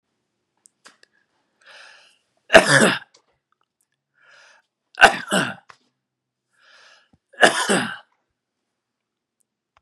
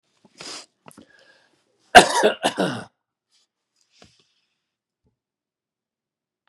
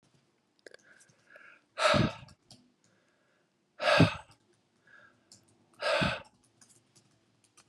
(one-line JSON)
{"three_cough_length": "9.8 s", "three_cough_amplitude": 32768, "three_cough_signal_mean_std_ratio": 0.24, "cough_length": "6.5 s", "cough_amplitude": 32768, "cough_signal_mean_std_ratio": 0.2, "exhalation_length": "7.7 s", "exhalation_amplitude": 10191, "exhalation_signal_mean_std_ratio": 0.29, "survey_phase": "beta (2021-08-13 to 2022-03-07)", "age": "65+", "gender": "Male", "wearing_mask": "No", "symptom_cough_any": true, "symptom_runny_or_blocked_nose": true, "symptom_headache": true, "symptom_onset": "3 days", "smoker_status": "Never smoked", "respiratory_condition_asthma": false, "respiratory_condition_other": false, "recruitment_source": "Test and Trace", "submission_delay": "2 days", "covid_test_result": "Positive", "covid_test_method": "RT-qPCR", "covid_ct_value": 16.4, "covid_ct_gene": "ORF1ab gene", "covid_ct_mean": 16.8, "covid_viral_load": "3000000 copies/ml", "covid_viral_load_category": "High viral load (>1M copies/ml)"}